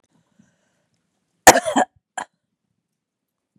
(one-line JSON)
{"cough_length": "3.6 s", "cough_amplitude": 32768, "cough_signal_mean_std_ratio": 0.18, "survey_phase": "beta (2021-08-13 to 2022-03-07)", "age": "45-64", "gender": "Female", "wearing_mask": "No", "symptom_none": true, "smoker_status": "Never smoked", "respiratory_condition_asthma": false, "respiratory_condition_other": false, "recruitment_source": "REACT", "submission_delay": "1 day", "covid_test_result": "Negative", "covid_test_method": "RT-qPCR", "influenza_a_test_result": "Negative", "influenza_b_test_result": "Negative"}